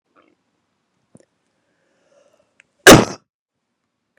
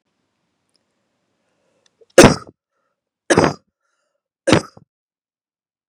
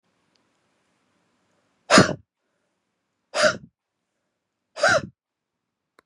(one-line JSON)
{"cough_length": "4.2 s", "cough_amplitude": 32768, "cough_signal_mean_std_ratio": 0.17, "three_cough_length": "5.9 s", "three_cough_amplitude": 32768, "three_cough_signal_mean_std_ratio": 0.21, "exhalation_length": "6.1 s", "exhalation_amplitude": 32202, "exhalation_signal_mean_std_ratio": 0.24, "survey_phase": "beta (2021-08-13 to 2022-03-07)", "age": "18-44", "gender": "Female", "wearing_mask": "No", "symptom_cough_any": true, "symptom_shortness_of_breath": true, "symptom_fatigue": true, "symptom_change_to_sense_of_smell_or_taste": true, "symptom_loss_of_taste": true, "symptom_onset": "4 days", "smoker_status": "Ex-smoker", "respiratory_condition_asthma": true, "respiratory_condition_other": false, "recruitment_source": "Test and Trace", "submission_delay": "2 days", "covid_test_result": "Positive", "covid_test_method": "RT-qPCR", "covid_ct_value": 13.3, "covid_ct_gene": "N gene", "covid_ct_mean": 13.7, "covid_viral_load": "33000000 copies/ml", "covid_viral_load_category": "High viral load (>1M copies/ml)"}